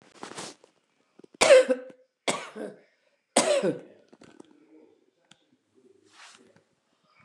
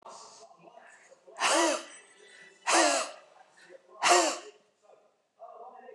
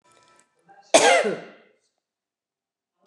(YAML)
three_cough_length: 7.2 s
three_cough_amplitude: 23865
three_cough_signal_mean_std_ratio: 0.27
exhalation_length: 5.9 s
exhalation_amplitude: 10911
exhalation_signal_mean_std_ratio: 0.4
cough_length: 3.1 s
cough_amplitude: 28637
cough_signal_mean_std_ratio: 0.29
survey_phase: beta (2021-08-13 to 2022-03-07)
age: 65+
gender: Female
wearing_mask: 'No'
symptom_cough_any: true
smoker_status: Never smoked
respiratory_condition_asthma: false
respiratory_condition_other: false
recruitment_source: REACT
submission_delay: 4 days
covid_test_result: Negative
covid_test_method: RT-qPCR
influenza_a_test_result: Negative
influenza_b_test_result: Negative